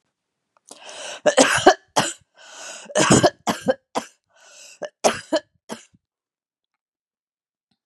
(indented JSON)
{
  "three_cough_length": "7.9 s",
  "three_cough_amplitude": 32767,
  "three_cough_signal_mean_std_ratio": 0.32,
  "survey_phase": "beta (2021-08-13 to 2022-03-07)",
  "age": "45-64",
  "gender": "Female",
  "wearing_mask": "No",
  "symptom_change_to_sense_of_smell_or_taste": true,
  "smoker_status": "Ex-smoker",
  "respiratory_condition_asthma": false,
  "respiratory_condition_other": false,
  "recruitment_source": "REACT",
  "submission_delay": "7 days",
  "covid_test_result": "Negative",
  "covid_test_method": "RT-qPCR"
}